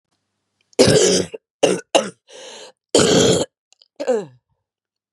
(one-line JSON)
{"cough_length": "5.1 s", "cough_amplitude": 32767, "cough_signal_mean_std_ratio": 0.44, "survey_phase": "beta (2021-08-13 to 2022-03-07)", "age": "45-64", "gender": "Female", "wearing_mask": "No", "symptom_cough_any": true, "symptom_new_continuous_cough": true, "symptom_runny_or_blocked_nose": true, "symptom_abdominal_pain": true, "symptom_fatigue": true, "symptom_headache": true, "symptom_change_to_sense_of_smell_or_taste": true, "symptom_onset": "2 days", "smoker_status": "Never smoked", "respiratory_condition_asthma": true, "respiratory_condition_other": false, "recruitment_source": "Test and Trace", "submission_delay": "1 day", "covid_test_result": "Positive", "covid_test_method": "RT-qPCR", "covid_ct_value": 16.2, "covid_ct_gene": "N gene", "covid_ct_mean": 16.2, "covid_viral_load": "5000000 copies/ml", "covid_viral_load_category": "High viral load (>1M copies/ml)"}